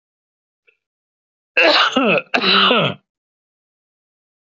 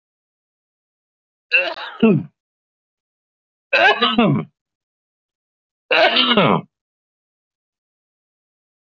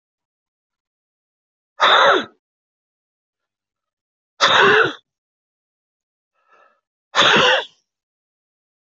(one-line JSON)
{"cough_length": "4.5 s", "cough_amplitude": 26193, "cough_signal_mean_std_ratio": 0.43, "three_cough_length": "8.9 s", "three_cough_amplitude": 25936, "three_cough_signal_mean_std_ratio": 0.36, "exhalation_length": "8.9 s", "exhalation_amplitude": 27083, "exhalation_signal_mean_std_ratio": 0.32, "survey_phase": "beta (2021-08-13 to 2022-03-07)", "age": "45-64", "gender": "Male", "wearing_mask": "No", "symptom_none": true, "symptom_onset": "13 days", "smoker_status": "Ex-smoker", "respiratory_condition_asthma": false, "respiratory_condition_other": false, "recruitment_source": "REACT", "submission_delay": "1 day", "covid_test_result": "Negative", "covid_test_method": "RT-qPCR"}